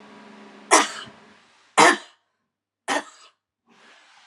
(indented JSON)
{
  "three_cough_length": "4.3 s",
  "three_cough_amplitude": 28498,
  "three_cough_signal_mean_std_ratio": 0.27,
  "survey_phase": "beta (2021-08-13 to 2022-03-07)",
  "age": "65+",
  "gender": "Female",
  "wearing_mask": "No",
  "symptom_none": true,
  "smoker_status": "Never smoked",
  "respiratory_condition_asthma": false,
  "respiratory_condition_other": false,
  "recruitment_source": "REACT",
  "submission_delay": "1 day",
  "covid_test_result": "Negative",
  "covid_test_method": "RT-qPCR",
  "influenza_a_test_result": "Negative",
  "influenza_b_test_result": "Negative"
}